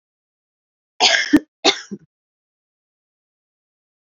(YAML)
cough_length: 4.2 s
cough_amplitude: 32768
cough_signal_mean_std_ratio: 0.25
survey_phase: beta (2021-08-13 to 2022-03-07)
age: 18-44
gender: Female
wearing_mask: 'No'
symptom_new_continuous_cough: true
symptom_runny_or_blocked_nose: true
symptom_shortness_of_breath: true
symptom_sore_throat: true
symptom_fatigue: true
symptom_fever_high_temperature: true
symptom_headache: true
symptom_change_to_sense_of_smell_or_taste: true
symptom_onset: 5 days
smoker_status: Prefer not to say
respiratory_condition_asthma: true
respiratory_condition_other: false
recruitment_source: Test and Trace
submission_delay: 2 days
covid_test_result: Positive
covid_test_method: RT-qPCR
covid_ct_value: 14.7
covid_ct_gene: ORF1ab gene
covid_ct_mean: 15.0
covid_viral_load: 12000000 copies/ml
covid_viral_load_category: High viral load (>1M copies/ml)